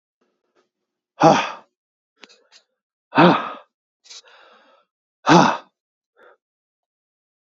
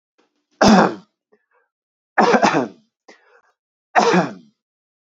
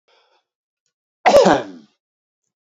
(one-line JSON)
{"exhalation_length": "7.5 s", "exhalation_amplitude": 30310, "exhalation_signal_mean_std_ratio": 0.26, "three_cough_length": "5.0 s", "three_cough_amplitude": 32003, "three_cough_signal_mean_std_ratio": 0.38, "cough_length": "2.6 s", "cough_amplitude": 28466, "cough_signal_mean_std_ratio": 0.3, "survey_phase": "beta (2021-08-13 to 2022-03-07)", "age": "18-44", "gender": "Male", "wearing_mask": "No", "symptom_fatigue": true, "symptom_headache": true, "symptom_onset": "13 days", "smoker_status": "Ex-smoker", "respiratory_condition_asthma": false, "respiratory_condition_other": false, "recruitment_source": "REACT", "submission_delay": "1 day", "covid_test_result": "Negative", "covid_test_method": "RT-qPCR", "influenza_a_test_result": "Negative", "influenza_b_test_result": "Negative"}